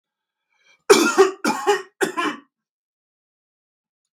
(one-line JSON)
{"cough_length": "4.2 s", "cough_amplitude": 32768, "cough_signal_mean_std_ratio": 0.35, "survey_phase": "beta (2021-08-13 to 2022-03-07)", "age": "65+", "gender": "Male", "wearing_mask": "No", "symptom_none": true, "smoker_status": "Never smoked", "respiratory_condition_asthma": false, "respiratory_condition_other": false, "recruitment_source": "REACT", "submission_delay": "3 days", "covid_test_result": "Negative", "covid_test_method": "RT-qPCR"}